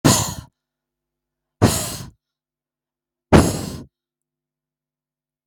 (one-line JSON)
{"exhalation_length": "5.5 s", "exhalation_amplitude": 32768, "exhalation_signal_mean_std_ratio": 0.29, "survey_phase": "beta (2021-08-13 to 2022-03-07)", "age": "45-64", "gender": "Female", "wearing_mask": "No", "symptom_runny_or_blocked_nose": true, "symptom_fatigue": true, "symptom_headache": true, "symptom_onset": "4 days", "smoker_status": "Never smoked", "respiratory_condition_asthma": false, "respiratory_condition_other": false, "recruitment_source": "REACT", "submission_delay": "3 days", "covid_test_result": "Negative", "covid_test_method": "RT-qPCR", "influenza_a_test_result": "Negative", "influenza_b_test_result": "Negative"}